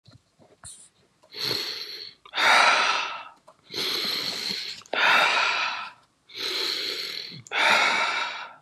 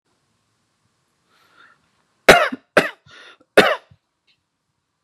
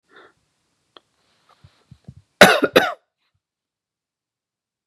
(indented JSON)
{
  "exhalation_length": "8.6 s",
  "exhalation_amplitude": 17344,
  "exhalation_signal_mean_std_ratio": 0.63,
  "three_cough_length": "5.0 s",
  "three_cough_amplitude": 32768,
  "three_cough_signal_mean_std_ratio": 0.22,
  "cough_length": "4.9 s",
  "cough_amplitude": 32768,
  "cough_signal_mean_std_ratio": 0.19,
  "survey_phase": "beta (2021-08-13 to 2022-03-07)",
  "age": "18-44",
  "gender": "Male",
  "wearing_mask": "No",
  "symptom_none": true,
  "smoker_status": "Current smoker (11 or more cigarettes per day)",
  "respiratory_condition_asthma": false,
  "respiratory_condition_other": false,
  "recruitment_source": "REACT",
  "submission_delay": "1 day",
  "covid_test_result": "Negative",
  "covid_test_method": "RT-qPCR",
  "influenza_a_test_result": "Negative",
  "influenza_b_test_result": "Negative"
}